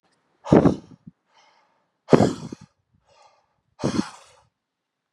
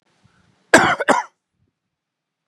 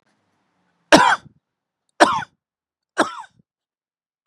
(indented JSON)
{
  "exhalation_length": "5.1 s",
  "exhalation_amplitude": 32677,
  "exhalation_signal_mean_std_ratio": 0.25,
  "cough_length": "2.5 s",
  "cough_amplitude": 32768,
  "cough_signal_mean_std_ratio": 0.29,
  "three_cough_length": "4.3 s",
  "three_cough_amplitude": 32768,
  "three_cough_signal_mean_std_ratio": 0.26,
  "survey_phase": "beta (2021-08-13 to 2022-03-07)",
  "age": "45-64",
  "gender": "Male",
  "wearing_mask": "No",
  "symptom_none": true,
  "smoker_status": "Ex-smoker",
  "respiratory_condition_asthma": false,
  "respiratory_condition_other": false,
  "recruitment_source": "REACT",
  "submission_delay": "1 day",
  "covid_test_result": "Negative",
  "covid_test_method": "RT-qPCR",
  "influenza_a_test_result": "Negative",
  "influenza_b_test_result": "Negative"
}